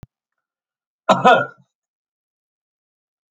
{"cough_length": "3.3 s", "cough_amplitude": 29053, "cough_signal_mean_std_ratio": 0.23, "survey_phase": "alpha (2021-03-01 to 2021-08-12)", "age": "65+", "gender": "Male", "wearing_mask": "No", "symptom_none": true, "smoker_status": "Ex-smoker", "respiratory_condition_asthma": false, "respiratory_condition_other": false, "recruitment_source": "REACT", "submission_delay": "1 day", "covid_test_result": "Negative", "covid_test_method": "RT-qPCR"}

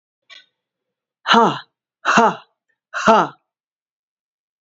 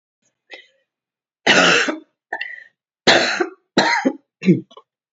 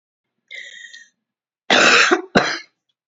{"exhalation_length": "4.6 s", "exhalation_amplitude": 32768, "exhalation_signal_mean_std_ratio": 0.33, "three_cough_length": "5.1 s", "three_cough_amplitude": 29978, "three_cough_signal_mean_std_ratio": 0.42, "cough_length": "3.1 s", "cough_amplitude": 29489, "cough_signal_mean_std_ratio": 0.4, "survey_phase": "beta (2021-08-13 to 2022-03-07)", "age": "45-64", "gender": "Female", "wearing_mask": "No", "symptom_cough_any": true, "symptom_runny_or_blocked_nose": true, "symptom_sore_throat": true, "symptom_fatigue": true, "symptom_fever_high_temperature": true, "symptom_headache": true, "symptom_onset": "2 days", "smoker_status": "Never smoked", "respiratory_condition_asthma": false, "respiratory_condition_other": false, "recruitment_source": "Test and Trace", "submission_delay": "1 day", "covid_test_result": "Positive", "covid_test_method": "RT-qPCR", "covid_ct_value": 23.8, "covid_ct_gene": "ORF1ab gene"}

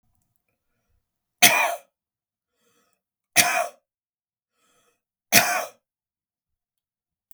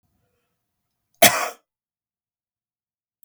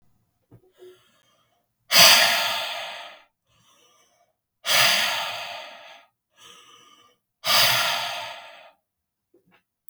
{"three_cough_length": "7.3 s", "three_cough_amplitude": 32768, "three_cough_signal_mean_std_ratio": 0.25, "cough_length": "3.2 s", "cough_amplitude": 32768, "cough_signal_mean_std_ratio": 0.18, "exhalation_length": "9.9 s", "exhalation_amplitude": 32768, "exhalation_signal_mean_std_ratio": 0.37, "survey_phase": "beta (2021-08-13 to 2022-03-07)", "age": "18-44", "gender": "Male", "wearing_mask": "No", "symptom_none": true, "smoker_status": "Never smoked", "respiratory_condition_asthma": false, "respiratory_condition_other": false, "recruitment_source": "REACT", "submission_delay": "0 days", "covid_test_result": "Negative", "covid_test_method": "RT-qPCR", "influenza_a_test_result": "Negative", "influenza_b_test_result": "Negative"}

